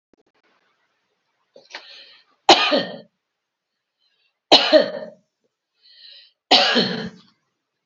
{"three_cough_length": "7.9 s", "three_cough_amplitude": 32767, "three_cough_signal_mean_std_ratio": 0.3, "survey_phase": "beta (2021-08-13 to 2022-03-07)", "age": "65+", "gender": "Female", "wearing_mask": "No", "symptom_none": true, "smoker_status": "Ex-smoker", "respiratory_condition_asthma": false, "respiratory_condition_other": false, "recruitment_source": "REACT", "submission_delay": "1 day", "covid_test_result": "Negative", "covid_test_method": "RT-qPCR", "influenza_a_test_result": "Negative", "influenza_b_test_result": "Negative"}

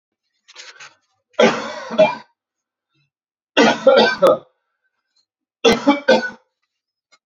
{"three_cough_length": "7.3 s", "three_cough_amplitude": 31417, "three_cough_signal_mean_std_ratio": 0.38, "survey_phase": "beta (2021-08-13 to 2022-03-07)", "age": "18-44", "gender": "Male", "wearing_mask": "No", "symptom_none": true, "smoker_status": "Ex-smoker", "respiratory_condition_asthma": false, "respiratory_condition_other": false, "recruitment_source": "REACT", "submission_delay": "11 days", "covid_test_result": "Negative", "covid_test_method": "RT-qPCR"}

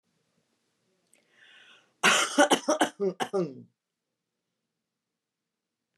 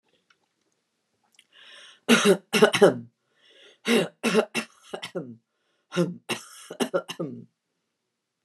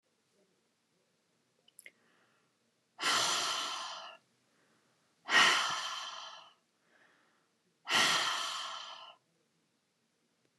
{"cough_length": "6.0 s", "cough_amplitude": 14432, "cough_signal_mean_std_ratio": 0.31, "three_cough_length": "8.4 s", "three_cough_amplitude": 25685, "three_cough_signal_mean_std_ratio": 0.33, "exhalation_length": "10.6 s", "exhalation_amplitude": 7182, "exhalation_signal_mean_std_ratio": 0.39, "survey_phase": "beta (2021-08-13 to 2022-03-07)", "age": "65+", "gender": "Female", "wearing_mask": "No", "symptom_none": true, "smoker_status": "Never smoked", "respiratory_condition_asthma": false, "respiratory_condition_other": false, "recruitment_source": "REACT", "submission_delay": "0 days", "covid_test_result": "Negative", "covid_test_method": "RT-qPCR"}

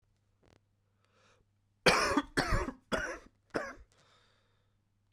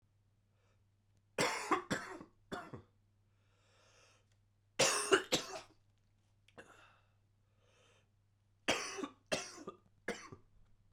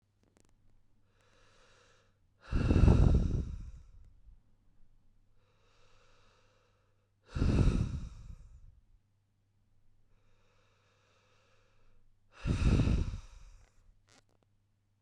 {"cough_length": "5.1 s", "cough_amplitude": 8745, "cough_signal_mean_std_ratio": 0.34, "three_cough_length": "10.9 s", "three_cough_amplitude": 6162, "three_cough_signal_mean_std_ratio": 0.32, "exhalation_length": "15.0 s", "exhalation_amplitude": 8792, "exhalation_signal_mean_std_ratio": 0.33, "survey_phase": "beta (2021-08-13 to 2022-03-07)", "age": "18-44", "gender": "Male", "wearing_mask": "No", "symptom_cough_any": true, "symptom_runny_or_blocked_nose": true, "symptom_fatigue": true, "symptom_fever_high_temperature": true, "symptom_headache": true, "symptom_change_to_sense_of_smell_or_taste": true, "symptom_loss_of_taste": true, "symptom_other": true, "symptom_onset": "3 days", "smoker_status": "Never smoked", "respiratory_condition_asthma": false, "respiratory_condition_other": false, "recruitment_source": "Test and Trace", "submission_delay": "1 day", "covid_test_result": "Positive", "covid_test_method": "RT-qPCR", "covid_ct_value": 23.6, "covid_ct_gene": "ORF1ab gene", "covid_ct_mean": 24.2, "covid_viral_load": "11000 copies/ml", "covid_viral_load_category": "Low viral load (10K-1M copies/ml)"}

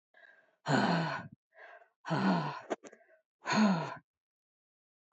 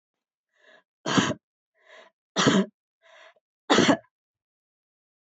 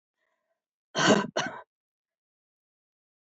{"exhalation_length": "5.1 s", "exhalation_amplitude": 5625, "exhalation_signal_mean_std_ratio": 0.46, "three_cough_length": "5.2 s", "three_cough_amplitude": 17176, "three_cough_signal_mean_std_ratio": 0.31, "cough_length": "3.2 s", "cough_amplitude": 13036, "cough_signal_mean_std_ratio": 0.27, "survey_phase": "alpha (2021-03-01 to 2021-08-12)", "age": "65+", "gender": "Female", "wearing_mask": "No", "symptom_fatigue": true, "symptom_onset": "12 days", "smoker_status": "Never smoked", "respiratory_condition_asthma": false, "respiratory_condition_other": false, "recruitment_source": "REACT", "submission_delay": "1 day", "covid_test_result": "Negative", "covid_test_method": "RT-qPCR"}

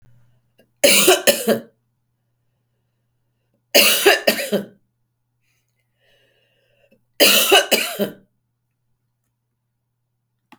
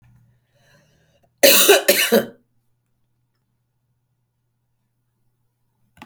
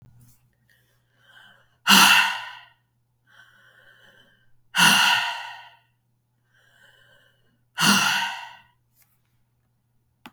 {"three_cough_length": "10.6 s", "three_cough_amplitude": 32768, "three_cough_signal_mean_std_ratio": 0.34, "cough_length": "6.1 s", "cough_amplitude": 32768, "cough_signal_mean_std_ratio": 0.27, "exhalation_length": "10.3 s", "exhalation_amplitude": 32766, "exhalation_signal_mean_std_ratio": 0.32, "survey_phase": "beta (2021-08-13 to 2022-03-07)", "age": "65+", "gender": "Female", "wearing_mask": "No", "symptom_cough_any": true, "symptom_sore_throat": true, "symptom_fatigue": true, "symptom_headache": true, "smoker_status": "Never smoked", "respiratory_condition_asthma": false, "respiratory_condition_other": false, "recruitment_source": "Test and Trace", "submission_delay": "0 days", "covid_test_result": "Positive", "covid_test_method": "LFT"}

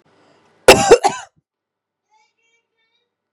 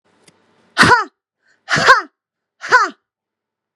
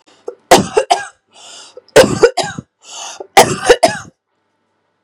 {"cough_length": "3.3 s", "cough_amplitude": 32768, "cough_signal_mean_std_ratio": 0.24, "exhalation_length": "3.8 s", "exhalation_amplitude": 32768, "exhalation_signal_mean_std_ratio": 0.35, "three_cough_length": "5.0 s", "three_cough_amplitude": 32768, "three_cough_signal_mean_std_ratio": 0.38, "survey_phase": "beta (2021-08-13 to 2022-03-07)", "age": "18-44", "gender": "Female", "wearing_mask": "No", "symptom_runny_or_blocked_nose": true, "symptom_shortness_of_breath": true, "symptom_abdominal_pain": true, "symptom_fatigue": true, "symptom_headache": true, "symptom_onset": "13 days", "smoker_status": "Ex-smoker", "respiratory_condition_asthma": true, "respiratory_condition_other": false, "recruitment_source": "REACT", "submission_delay": "2 days", "covid_test_result": "Negative", "covid_test_method": "RT-qPCR", "influenza_a_test_result": "Negative", "influenza_b_test_result": "Negative"}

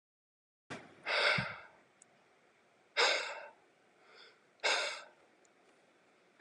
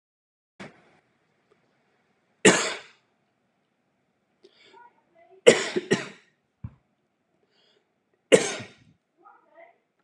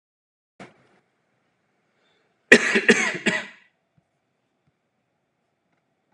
{"exhalation_length": "6.4 s", "exhalation_amplitude": 4622, "exhalation_signal_mean_std_ratio": 0.37, "three_cough_length": "10.0 s", "three_cough_amplitude": 32287, "three_cough_signal_mean_std_ratio": 0.2, "cough_length": "6.1 s", "cough_amplitude": 32768, "cough_signal_mean_std_ratio": 0.23, "survey_phase": "beta (2021-08-13 to 2022-03-07)", "age": "18-44", "gender": "Male", "wearing_mask": "No", "symptom_none": true, "smoker_status": "Never smoked", "respiratory_condition_asthma": true, "respiratory_condition_other": false, "recruitment_source": "REACT", "submission_delay": "17 days", "covid_test_result": "Negative", "covid_test_method": "RT-qPCR"}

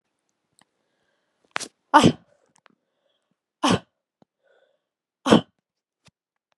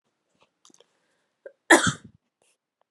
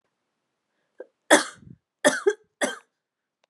{"exhalation_length": "6.6 s", "exhalation_amplitude": 31475, "exhalation_signal_mean_std_ratio": 0.2, "cough_length": "2.9 s", "cough_amplitude": 27403, "cough_signal_mean_std_ratio": 0.19, "three_cough_length": "3.5 s", "three_cough_amplitude": 29916, "three_cough_signal_mean_std_ratio": 0.25, "survey_phase": "beta (2021-08-13 to 2022-03-07)", "age": "18-44", "gender": "Female", "wearing_mask": "No", "symptom_none": true, "smoker_status": "Never smoked", "respiratory_condition_asthma": false, "respiratory_condition_other": false, "recruitment_source": "REACT", "submission_delay": "5 days", "covid_test_result": "Negative", "covid_test_method": "RT-qPCR", "influenza_a_test_result": "Negative", "influenza_b_test_result": "Negative"}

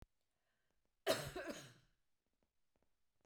{"cough_length": "3.3 s", "cough_amplitude": 2442, "cough_signal_mean_std_ratio": 0.28, "survey_phase": "beta (2021-08-13 to 2022-03-07)", "age": "45-64", "gender": "Female", "wearing_mask": "No", "symptom_none": true, "smoker_status": "Never smoked", "respiratory_condition_asthma": false, "respiratory_condition_other": false, "recruitment_source": "REACT", "submission_delay": "1 day", "covid_test_result": "Negative", "covid_test_method": "RT-qPCR", "influenza_a_test_result": "Negative", "influenza_b_test_result": "Negative"}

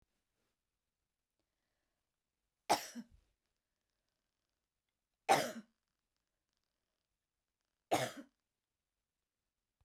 {"three_cough_length": "9.8 s", "three_cough_amplitude": 5448, "three_cough_signal_mean_std_ratio": 0.18, "survey_phase": "beta (2021-08-13 to 2022-03-07)", "age": "45-64", "gender": "Female", "wearing_mask": "No", "symptom_none": true, "smoker_status": "Never smoked", "respiratory_condition_asthma": false, "respiratory_condition_other": false, "recruitment_source": "REACT", "submission_delay": "1 day", "covid_test_result": "Negative", "covid_test_method": "RT-qPCR", "influenza_a_test_result": "Negative", "influenza_b_test_result": "Negative"}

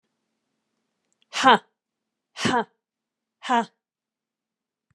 {"exhalation_length": "4.9 s", "exhalation_amplitude": 26837, "exhalation_signal_mean_std_ratio": 0.24, "survey_phase": "beta (2021-08-13 to 2022-03-07)", "age": "45-64", "gender": "Female", "wearing_mask": "No", "symptom_none": true, "symptom_onset": "12 days", "smoker_status": "Never smoked", "respiratory_condition_asthma": true, "respiratory_condition_other": false, "recruitment_source": "REACT", "submission_delay": "2 days", "covid_test_result": "Negative", "covid_test_method": "RT-qPCR", "influenza_a_test_result": "Negative", "influenza_b_test_result": "Negative"}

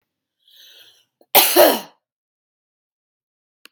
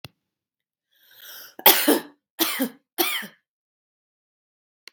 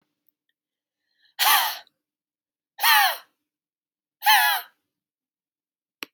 {"cough_length": "3.7 s", "cough_amplitude": 32768, "cough_signal_mean_std_ratio": 0.26, "three_cough_length": "4.9 s", "three_cough_amplitude": 32768, "three_cough_signal_mean_std_ratio": 0.29, "exhalation_length": "6.1 s", "exhalation_amplitude": 18965, "exhalation_signal_mean_std_ratio": 0.33, "survey_phase": "beta (2021-08-13 to 2022-03-07)", "age": "18-44", "gender": "Female", "wearing_mask": "No", "symptom_sore_throat": true, "symptom_headache": true, "symptom_onset": "2 days", "smoker_status": "Never smoked", "respiratory_condition_asthma": false, "respiratory_condition_other": false, "recruitment_source": "Test and Trace", "submission_delay": "1 day", "covid_test_result": "Positive", "covid_test_method": "RT-qPCR", "covid_ct_value": 20.7, "covid_ct_gene": "ORF1ab gene", "covid_ct_mean": 21.2, "covid_viral_load": "110000 copies/ml", "covid_viral_load_category": "Low viral load (10K-1M copies/ml)"}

